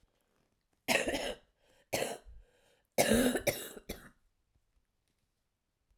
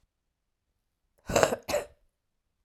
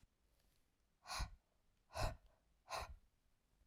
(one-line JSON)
{"three_cough_length": "6.0 s", "three_cough_amplitude": 8348, "three_cough_signal_mean_std_ratio": 0.36, "cough_length": "2.6 s", "cough_amplitude": 26308, "cough_signal_mean_std_ratio": 0.27, "exhalation_length": "3.7 s", "exhalation_amplitude": 1170, "exhalation_signal_mean_std_ratio": 0.35, "survey_phase": "alpha (2021-03-01 to 2021-08-12)", "age": "18-44", "gender": "Female", "wearing_mask": "No", "symptom_cough_any": true, "symptom_shortness_of_breath": true, "smoker_status": "Never smoked", "respiratory_condition_asthma": true, "respiratory_condition_other": false, "recruitment_source": "REACT", "submission_delay": "5 days", "covid_test_result": "Negative", "covid_test_method": "RT-qPCR"}